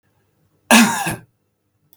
cough_length: 2.0 s
cough_amplitude: 32768
cough_signal_mean_std_ratio: 0.34
survey_phase: beta (2021-08-13 to 2022-03-07)
age: 45-64
gender: Male
wearing_mask: 'No'
symptom_none: true
smoker_status: Never smoked
respiratory_condition_asthma: false
respiratory_condition_other: false
recruitment_source: REACT
submission_delay: 1 day
covid_test_result: Negative
covid_test_method: RT-qPCR
influenza_a_test_result: Negative
influenza_b_test_result: Negative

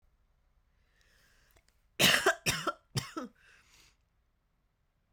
cough_length: 5.1 s
cough_amplitude: 10041
cough_signal_mean_std_ratio: 0.28
survey_phase: beta (2021-08-13 to 2022-03-07)
age: 18-44
gender: Female
wearing_mask: 'No'
symptom_cough_any: true
symptom_runny_or_blocked_nose: true
symptom_sore_throat: true
symptom_abdominal_pain: true
symptom_fatigue: true
symptom_headache: true
smoker_status: Never smoked
respiratory_condition_asthma: false
respiratory_condition_other: false
recruitment_source: Test and Trace
submission_delay: 2 days
covid_test_result: Positive
covid_test_method: RT-qPCR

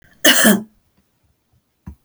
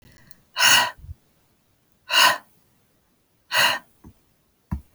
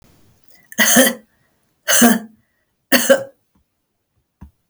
cough_length: 2.0 s
cough_amplitude: 32768
cough_signal_mean_std_ratio: 0.35
exhalation_length: 4.9 s
exhalation_amplitude: 25430
exhalation_signal_mean_std_ratio: 0.34
three_cough_length: 4.7 s
three_cough_amplitude: 32768
three_cough_signal_mean_std_ratio: 0.36
survey_phase: beta (2021-08-13 to 2022-03-07)
age: 45-64
gender: Female
wearing_mask: 'No'
symptom_none: true
smoker_status: Never smoked
respiratory_condition_asthma: false
respiratory_condition_other: false
recruitment_source: REACT
submission_delay: 3 days
covid_test_result: Negative
covid_test_method: RT-qPCR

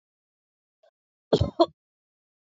cough_length: 2.6 s
cough_amplitude: 14924
cough_signal_mean_std_ratio: 0.2
survey_phase: alpha (2021-03-01 to 2021-08-12)
age: 45-64
gender: Female
wearing_mask: 'No'
symptom_none: true
smoker_status: Ex-smoker
respiratory_condition_asthma: false
respiratory_condition_other: false
recruitment_source: REACT
submission_delay: 2 days
covid_test_result: Negative
covid_test_method: RT-qPCR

